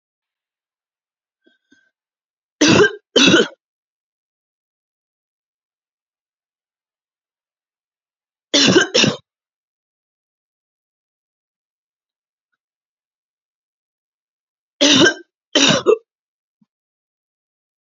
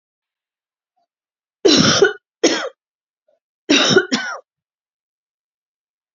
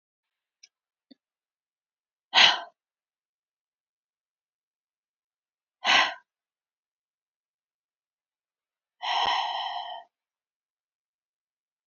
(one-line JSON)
{"three_cough_length": "17.9 s", "three_cough_amplitude": 32768, "three_cough_signal_mean_std_ratio": 0.25, "cough_length": "6.1 s", "cough_amplitude": 32768, "cough_signal_mean_std_ratio": 0.35, "exhalation_length": "11.9 s", "exhalation_amplitude": 23037, "exhalation_signal_mean_std_ratio": 0.23, "survey_phase": "beta (2021-08-13 to 2022-03-07)", "age": "45-64", "gender": "Female", "wearing_mask": "No", "symptom_none": true, "smoker_status": "Never smoked", "respiratory_condition_asthma": false, "respiratory_condition_other": false, "recruitment_source": "REACT", "submission_delay": "0 days", "covid_test_result": "Negative", "covid_test_method": "RT-qPCR", "influenza_a_test_result": "Negative", "influenza_b_test_result": "Negative"}